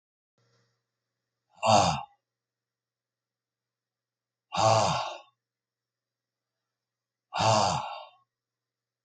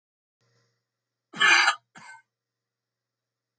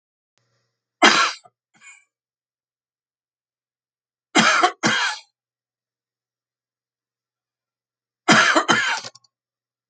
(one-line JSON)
{"exhalation_length": "9.0 s", "exhalation_amplitude": 12236, "exhalation_signal_mean_std_ratio": 0.31, "cough_length": "3.6 s", "cough_amplitude": 15605, "cough_signal_mean_std_ratio": 0.26, "three_cough_length": "9.9 s", "three_cough_amplitude": 32767, "three_cough_signal_mean_std_ratio": 0.31, "survey_phase": "beta (2021-08-13 to 2022-03-07)", "age": "65+", "gender": "Male", "wearing_mask": "No", "symptom_none": true, "smoker_status": "Current smoker (11 or more cigarettes per day)", "respiratory_condition_asthma": false, "respiratory_condition_other": false, "recruitment_source": "REACT", "submission_delay": "3 days", "covid_test_result": "Negative", "covid_test_method": "RT-qPCR", "influenza_a_test_result": "Negative", "influenza_b_test_result": "Negative"}